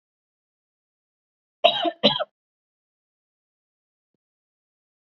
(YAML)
cough_length: 5.1 s
cough_amplitude: 27663
cough_signal_mean_std_ratio: 0.2
survey_phase: beta (2021-08-13 to 2022-03-07)
age: 18-44
gender: Female
wearing_mask: 'No'
symptom_none: true
symptom_onset: 11 days
smoker_status: Never smoked
respiratory_condition_asthma: false
respiratory_condition_other: false
recruitment_source: REACT
submission_delay: 2 days
covid_test_result: Negative
covid_test_method: RT-qPCR
influenza_a_test_result: Negative
influenza_b_test_result: Negative